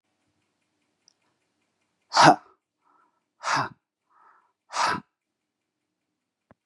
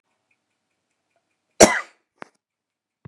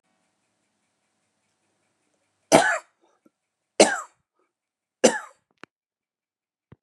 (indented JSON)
{
  "exhalation_length": "6.7 s",
  "exhalation_amplitude": 26087,
  "exhalation_signal_mean_std_ratio": 0.21,
  "cough_length": "3.1 s",
  "cough_amplitude": 32768,
  "cough_signal_mean_std_ratio": 0.16,
  "three_cough_length": "6.8 s",
  "three_cough_amplitude": 32767,
  "three_cough_signal_mean_std_ratio": 0.2,
  "survey_phase": "beta (2021-08-13 to 2022-03-07)",
  "age": "45-64",
  "gender": "Male",
  "wearing_mask": "No",
  "symptom_none": true,
  "smoker_status": "Never smoked",
  "respiratory_condition_asthma": false,
  "respiratory_condition_other": false,
  "recruitment_source": "REACT",
  "submission_delay": "2 days",
  "covid_test_result": "Negative",
  "covid_test_method": "RT-qPCR"
}